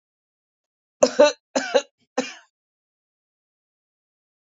{"three_cough_length": "4.4 s", "three_cough_amplitude": 27813, "three_cough_signal_mean_std_ratio": 0.23, "survey_phase": "beta (2021-08-13 to 2022-03-07)", "age": "45-64", "gender": "Female", "wearing_mask": "No", "symptom_cough_any": true, "symptom_new_continuous_cough": true, "symptom_runny_or_blocked_nose": true, "symptom_shortness_of_breath": true, "symptom_sore_throat": true, "symptom_fatigue": true, "symptom_fever_high_temperature": true, "symptom_headache": true, "symptom_change_to_sense_of_smell_or_taste": true, "symptom_loss_of_taste": true, "symptom_onset": "2 days", "smoker_status": "Current smoker (e-cigarettes or vapes only)", "respiratory_condition_asthma": false, "respiratory_condition_other": true, "recruitment_source": "Test and Trace", "submission_delay": "1 day", "covid_test_result": "Positive", "covid_test_method": "RT-qPCR", "covid_ct_value": 22.0, "covid_ct_gene": "ORF1ab gene"}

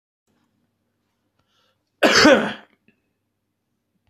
{"cough_length": "4.1 s", "cough_amplitude": 26043, "cough_signal_mean_std_ratio": 0.27, "survey_phase": "beta (2021-08-13 to 2022-03-07)", "age": "45-64", "gender": "Male", "wearing_mask": "No", "symptom_cough_any": true, "symptom_runny_or_blocked_nose": true, "symptom_sore_throat": true, "symptom_abdominal_pain": true, "symptom_diarrhoea": true, "symptom_fatigue": true, "symptom_headache": true, "symptom_onset": "2 days", "smoker_status": "Ex-smoker", "respiratory_condition_asthma": false, "respiratory_condition_other": false, "recruitment_source": "Test and Trace", "submission_delay": "2 days", "covid_test_result": "Positive", "covid_test_method": "RT-qPCR", "covid_ct_value": 24.4, "covid_ct_gene": "N gene", "covid_ct_mean": 25.2, "covid_viral_load": "5400 copies/ml", "covid_viral_load_category": "Minimal viral load (< 10K copies/ml)"}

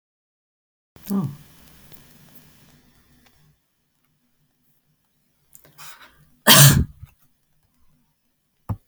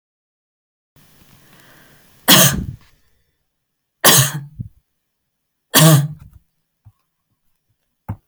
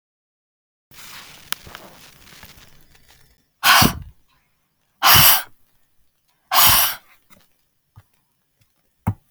{"cough_length": "8.9 s", "cough_amplitude": 32768, "cough_signal_mean_std_ratio": 0.21, "three_cough_length": "8.3 s", "three_cough_amplitude": 32768, "three_cough_signal_mean_std_ratio": 0.29, "exhalation_length": "9.3 s", "exhalation_amplitude": 32768, "exhalation_signal_mean_std_ratio": 0.3, "survey_phase": "beta (2021-08-13 to 2022-03-07)", "age": "65+", "gender": "Female", "wearing_mask": "No", "symptom_none": true, "smoker_status": "Ex-smoker", "respiratory_condition_asthma": false, "respiratory_condition_other": false, "recruitment_source": "REACT", "submission_delay": "2 days", "covid_test_result": "Negative", "covid_test_method": "RT-qPCR"}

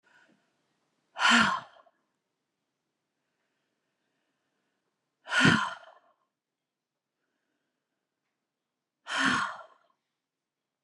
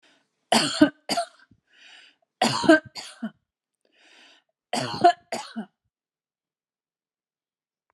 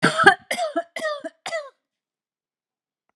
{"exhalation_length": "10.8 s", "exhalation_amplitude": 11919, "exhalation_signal_mean_std_ratio": 0.26, "three_cough_length": "7.9 s", "three_cough_amplitude": 22316, "three_cough_signal_mean_std_ratio": 0.28, "cough_length": "3.2 s", "cough_amplitude": 32322, "cough_signal_mean_std_ratio": 0.35, "survey_phase": "beta (2021-08-13 to 2022-03-07)", "age": "45-64", "gender": "Female", "wearing_mask": "No", "symptom_none": true, "smoker_status": "Never smoked", "respiratory_condition_asthma": false, "respiratory_condition_other": false, "recruitment_source": "REACT", "submission_delay": "2 days", "covid_test_result": "Negative", "covid_test_method": "RT-qPCR"}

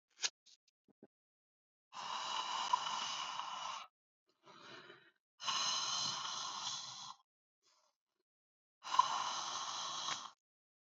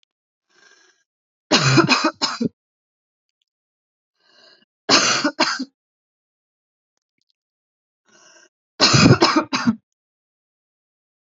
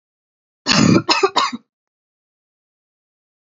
{"exhalation_length": "10.9 s", "exhalation_amplitude": 5509, "exhalation_signal_mean_std_ratio": 0.52, "three_cough_length": "11.3 s", "three_cough_amplitude": 32767, "three_cough_signal_mean_std_ratio": 0.33, "cough_length": "3.4 s", "cough_amplitude": 32705, "cough_signal_mean_std_ratio": 0.35, "survey_phase": "beta (2021-08-13 to 2022-03-07)", "age": "18-44", "gender": "Female", "wearing_mask": "No", "symptom_none": true, "smoker_status": "Current smoker (e-cigarettes or vapes only)", "respiratory_condition_asthma": false, "respiratory_condition_other": false, "recruitment_source": "REACT", "submission_delay": "4 days", "covid_test_result": "Negative", "covid_test_method": "RT-qPCR", "influenza_a_test_result": "Negative", "influenza_b_test_result": "Negative"}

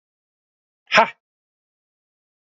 {"exhalation_length": "2.6 s", "exhalation_amplitude": 31827, "exhalation_signal_mean_std_ratio": 0.17, "survey_phase": "alpha (2021-03-01 to 2021-08-12)", "age": "18-44", "gender": "Male", "wearing_mask": "No", "symptom_cough_any": true, "symptom_fatigue": true, "symptom_onset": "2 days", "smoker_status": "Current smoker (1 to 10 cigarettes per day)", "respiratory_condition_asthma": false, "respiratory_condition_other": false, "recruitment_source": "Test and Trace", "submission_delay": "1 day", "covid_test_result": "Positive", "covid_test_method": "RT-qPCR"}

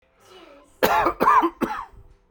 {"cough_length": "2.3 s", "cough_amplitude": 23160, "cough_signal_mean_std_ratio": 0.49, "survey_phase": "beta (2021-08-13 to 2022-03-07)", "age": "18-44", "gender": "Male", "wearing_mask": "No", "symptom_diarrhoea": true, "symptom_fatigue": true, "symptom_onset": "12 days", "smoker_status": "Never smoked", "respiratory_condition_asthma": false, "respiratory_condition_other": false, "recruitment_source": "REACT", "submission_delay": "2 days", "covid_test_result": "Negative", "covid_test_method": "RT-qPCR"}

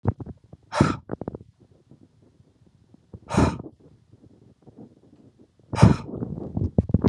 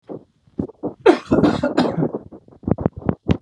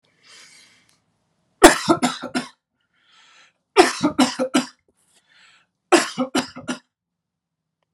{"exhalation_length": "7.1 s", "exhalation_amplitude": 29294, "exhalation_signal_mean_std_ratio": 0.32, "cough_length": "3.4 s", "cough_amplitude": 32440, "cough_signal_mean_std_ratio": 0.47, "three_cough_length": "7.9 s", "three_cough_amplitude": 32768, "three_cough_signal_mean_std_ratio": 0.29, "survey_phase": "beta (2021-08-13 to 2022-03-07)", "age": "45-64", "gender": "Male", "wearing_mask": "No", "symptom_none": true, "smoker_status": "Never smoked", "respiratory_condition_asthma": false, "respiratory_condition_other": false, "recruitment_source": "REACT", "submission_delay": "2 days", "covid_test_result": "Negative", "covid_test_method": "RT-qPCR"}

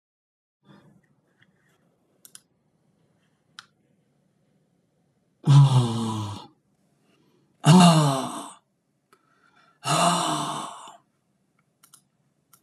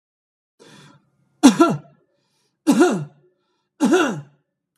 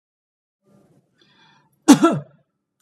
{"exhalation_length": "12.6 s", "exhalation_amplitude": 23670, "exhalation_signal_mean_std_ratio": 0.31, "three_cough_length": "4.8 s", "three_cough_amplitude": 32768, "three_cough_signal_mean_std_ratio": 0.36, "cough_length": "2.8 s", "cough_amplitude": 32768, "cough_signal_mean_std_ratio": 0.22, "survey_phase": "beta (2021-08-13 to 2022-03-07)", "age": "45-64", "gender": "Male", "wearing_mask": "No", "symptom_none": true, "smoker_status": "Never smoked", "respiratory_condition_asthma": false, "respiratory_condition_other": false, "recruitment_source": "REACT", "submission_delay": "1 day", "covid_test_result": "Negative", "covid_test_method": "RT-qPCR", "influenza_a_test_result": "Negative", "influenza_b_test_result": "Negative"}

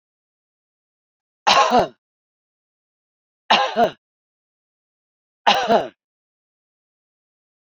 {"three_cough_length": "7.7 s", "three_cough_amplitude": 32767, "three_cough_signal_mean_std_ratio": 0.29, "survey_phase": "beta (2021-08-13 to 2022-03-07)", "age": "45-64", "gender": "Female", "wearing_mask": "No", "symptom_none": true, "smoker_status": "Current smoker (11 or more cigarettes per day)", "respiratory_condition_asthma": false, "respiratory_condition_other": false, "recruitment_source": "REACT", "submission_delay": "1 day", "covid_test_result": "Negative", "covid_test_method": "RT-qPCR"}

